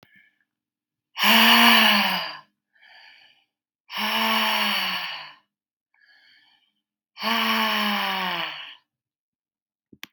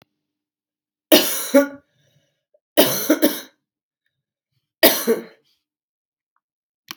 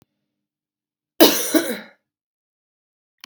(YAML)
exhalation_length: 10.1 s
exhalation_amplitude: 25517
exhalation_signal_mean_std_ratio: 0.47
three_cough_length: 7.0 s
three_cough_amplitude: 32768
three_cough_signal_mean_std_ratio: 0.3
cough_length: 3.3 s
cough_amplitude: 32768
cough_signal_mean_std_ratio: 0.26
survey_phase: beta (2021-08-13 to 2022-03-07)
age: 18-44
gender: Female
wearing_mask: 'No'
symptom_cough_any: true
symptom_runny_or_blocked_nose: true
symptom_fatigue: true
symptom_change_to_sense_of_smell_or_taste: true
symptom_loss_of_taste: true
symptom_other: true
symptom_onset: 4 days
smoker_status: Ex-smoker
respiratory_condition_asthma: false
respiratory_condition_other: false
recruitment_source: Test and Trace
submission_delay: 2 days
covid_test_result: Positive
covid_test_method: ePCR